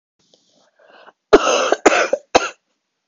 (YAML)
three_cough_length: 3.1 s
three_cough_amplitude: 32768
three_cough_signal_mean_std_ratio: 0.36
survey_phase: beta (2021-08-13 to 2022-03-07)
age: 18-44
gender: Female
wearing_mask: 'No'
symptom_cough_any: true
symptom_headache: true
smoker_status: Ex-smoker
respiratory_condition_asthma: false
respiratory_condition_other: false
recruitment_source: REACT
submission_delay: 3 days
covid_test_result: Negative
covid_test_method: RT-qPCR
influenza_a_test_result: Negative
influenza_b_test_result: Negative